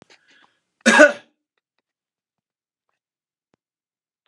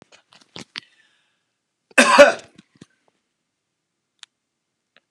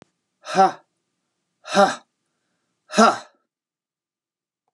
{
  "cough_length": "4.3 s",
  "cough_amplitude": 32678,
  "cough_signal_mean_std_ratio": 0.19,
  "three_cough_length": "5.1 s",
  "three_cough_amplitude": 32768,
  "three_cough_signal_mean_std_ratio": 0.2,
  "exhalation_length": "4.7 s",
  "exhalation_amplitude": 29710,
  "exhalation_signal_mean_std_ratio": 0.27,
  "survey_phase": "alpha (2021-03-01 to 2021-08-12)",
  "age": "65+",
  "gender": "Male",
  "wearing_mask": "No",
  "symptom_none": true,
  "smoker_status": "Ex-smoker",
  "respiratory_condition_asthma": false,
  "respiratory_condition_other": false,
  "recruitment_source": "REACT",
  "submission_delay": "2 days",
  "covid_test_result": "Negative",
  "covid_test_method": "RT-qPCR"
}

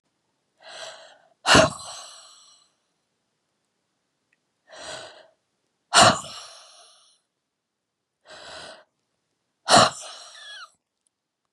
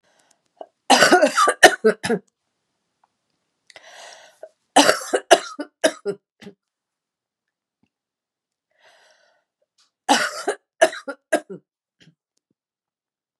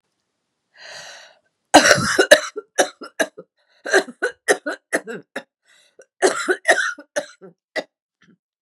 {
  "exhalation_length": "11.5 s",
  "exhalation_amplitude": 28249,
  "exhalation_signal_mean_std_ratio": 0.23,
  "three_cough_length": "13.4 s",
  "three_cough_amplitude": 32768,
  "three_cough_signal_mean_std_ratio": 0.28,
  "cough_length": "8.6 s",
  "cough_amplitude": 32768,
  "cough_signal_mean_std_ratio": 0.34,
  "survey_phase": "beta (2021-08-13 to 2022-03-07)",
  "age": "45-64",
  "gender": "Female",
  "wearing_mask": "No",
  "symptom_cough_any": true,
  "symptom_new_continuous_cough": true,
  "symptom_runny_or_blocked_nose": true,
  "symptom_shortness_of_breath": true,
  "symptom_fatigue": true,
  "symptom_fever_high_temperature": true,
  "symptom_headache": true,
  "symptom_change_to_sense_of_smell_or_taste": true,
  "smoker_status": "Never smoked",
  "respiratory_condition_asthma": true,
  "respiratory_condition_other": false,
  "recruitment_source": "Test and Trace",
  "submission_delay": "2 days",
  "covid_test_result": "Positive",
  "covid_test_method": "LFT"
}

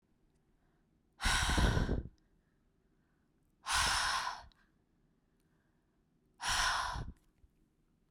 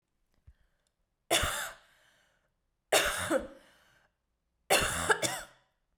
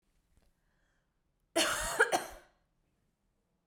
{
  "exhalation_length": "8.1 s",
  "exhalation_amplitude": 4524,
  "exhalation_signal_mean_std_ratio": 0.44,
  "three_cough_length": "6.0 s",
  "three_cough_amplitude": 8966,
  "three_cough_signal_mean_std_ratio": 0.38,
  "cough_length": "3.7 s",
  "cough_amplitude": 7195,
  "cough_signal_mean_std_ratio": 0.31,
  "survey_phase": "beta (2021-08-13 to 2022-03-07)",
  "age": "18-44",
  "gender": "Female",
  "wearing_mask": "No",
  "symptom_cough_any": true,
  "symptom_runny_or_blocked_nose": true,
  "symptom_sore_throat": true,
  "symptom_fatigue": true,
  "symptom_headache": true,
  "symptom_onset": "3 days",
  "smoker_status": "Never smoked",
  "respiratory_condition_asthma": false,
  "respiratory_condition_other": false,
  "recruitment_source": "Test and Trace",
  "submission_delay": "2 days",
  "covid_test_result": "Positive",
  "covid_test_method": "RT-qPCR",
  "covid_ct_value": 22.2,
  "covid_ct_gene": "N gene",
  "covid_ct_mean": 22.6,
  "covid_viral_load": "37000 copies/ml",
  "covid_viral_load_category": "Low viral load (10K-1M copies/ml)"
}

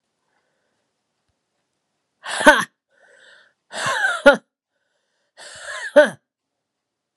{
  "exhalation_length": "7.2 s",
  "exhalation_amplitude": 32768,
  "exhalation_signal_mean_std_ratio": 0.25,
  "survey_phase": "beta (2021-08-13 to 2022-03-07)",
  "age": "65+",
  "gender": "Female",
  "wearing_mask": "No",
  "symptom_cough_any": true,
  "symptom_runny_or_blocked_nose": true,
  "symptom_fatigue": true,
  "symptom_fever_high_temperature": true,
  "symptom_change_to_sense_of_smell_or_taste": true,
  "symptom_onset": "5 days",
  "smoker_status": "Never smoked",
  "respiratory_condition_asthma": true,
  "respiratory_condition_other": false,
  "recruitment_source": "Test and Trace",
  "submission_delay": "2 days",
  "covid_test_result": "Positive",
  "covid_test_method": "RT-qPCR",
  "covid_ct_value": 25.9,
  "covid_ct_gene": "ORF1ab gene"
}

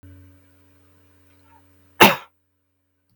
{
  "cough_length": "3.2 s",
  "cough_amplitude": 32768,
  "cough_signal_mean_std_ratio": 0.18,
  "survey_phase": "beta (2021-08-13 to 2022-03-07)",
  "age": "45-64",
  "gender": "Male",
  "wearing_mask": "No",
  "symptom_none": true,
  "smoker_status": "Never smoked",
  "respiratory_condition_asthma": false,
  "respiratory_condition_other": false,
  "recruitment_source": "REACT",
  "submission_delay": "1 day",
  "covid_test_result": "Negative",
  "covid_test_method": "RT-qPCR"
}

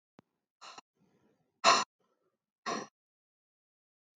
{
  "exhalation_length": "4.2 s",
  "exhalation_amplitude": 12674,
  "exhalation_signal_mean_std_ratio": 0.2,
  "survey_phase": "beta (2021-08-13 to 2022-03-07)",
  "age": "45-64",
  "gender": "Female",
  "wearing_mask": "No",
  "symptom_cough_any": true,
  "symptom_new_continuous_cough": true,
  "symptom_runny_or_blocked_nose": true,
  "symptom_sore_throat": true,
  "smoker_status": "Never smoked",
  "respiratory_condition_asthma": false,
  "respiratory_condition_other": false,
  "recruitment_source": "Test and Trace",
  "submission_delay": "2 days",
  "covid_test_result": "Positive",
  "covid_test_method": "RT-qPCR",
  "covid_ct_value": 14.8,
  "covid_ct_gene": "N gene"
}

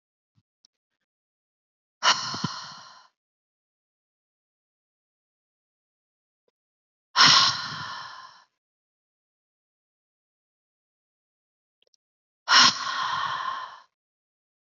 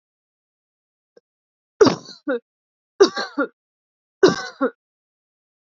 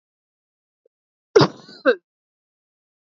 {
  "exhalation_length": "14.7 s",
  "exhalation_amplitude": 23737,
  "exhalation_signal_mean_std_ratio": 0.26,
  "three_cough_length": "5.7 s",
  "three_cough_amplitude": 27865,
  "three_cough_signal_mean_std_ratio": 0.26,
  "cough_length": "3.1 s",
  "cough_amplitude": 27376,
  "cough_signal_mean_std_ratio": 0.21,
  "survey_phase": "beta (2021-08-13 to 2022-03-07)",
  "age": "18-44",
  "gender": "Female",
  "wearing_mask": "No",
  "symptom_none": true,
  "smoker_status": "Never smoked",
  "respiratory_condition_asthma": false,
  "respiratory_condition_other": false,
  "recruitment_source": "REACT",
  "submission_delay": "1 day",
  "covid_test_result": "Negative",
  "covid_test_method": "RT-qPCR",
  "influenza_a_test_result": "Negative",
  "influenza_b_test_result": "Negative"
}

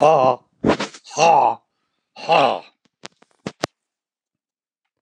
{
  "exhalation_length": "5.0 s",
  "exhalation_amplitude": 29204,
  "exhalation_signal_mean_std_ratio": 0.39,
  "survey_phase": "alpha (2021-03-01 to 2021-08-12)",
  "age": "65+",
  "gender": "Male",
  "wearing_mask": "No",
  "symptom_shortness_of_breath": true,
  "smoker_status": "Never smoked",
  "respiratory_condition_asthma": true,
  "respiratory_condition_other": true,
  "recruitment_source": "REACT",
  "submission_delay": "1 day",
  "covid_test_result": "Negative",
  "covid_test_method": "RT-qPCR"
}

